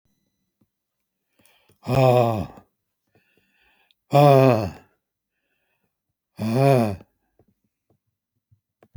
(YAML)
exhalation_length: 9.0 s
exhalation_amplitude: 26317
exhalation_signal_mean_std_ratio: 0.3
survey_phase: beta (2021-08-13 to 2022-03-07)
age: 65+
gender: Male
wearing_mask: 'No'
symptom_none: true
smoker_status: Never smoked
respiratory_condition_asthma: false
respiratory_condition_other: false
recruitment_source: REACT
submission_delay: 2 days
covid_test_result: Negative
covid_test_method: RT-qPCR
influenza_a_test_result: Negative
influenza_b_test_result: Negative